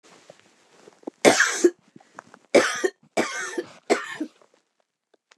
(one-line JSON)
{"cough_length": "5.4 s", "cough_amplitude": 27825, "cough_signal_mean_std_ratio": 0.34, "survey_phase": "beta (2021-08-13 to 2022-03-07)", "age": "65+", "gender": "Female", "wearing_mask": "No", "symptom_cough_any": true, "smoker_status": "Ex-smoker", "respiratory_condition_asthma": false, "respiratory_condition_other": true, "recruitment_source": "REACT", "submission_delay": "2 days", "covid_test_result": "Negative", "covid_test_method": "RT-qPCR", "influenza_a_test_result": "Negative", "influenza_b_test_result": "Negative"}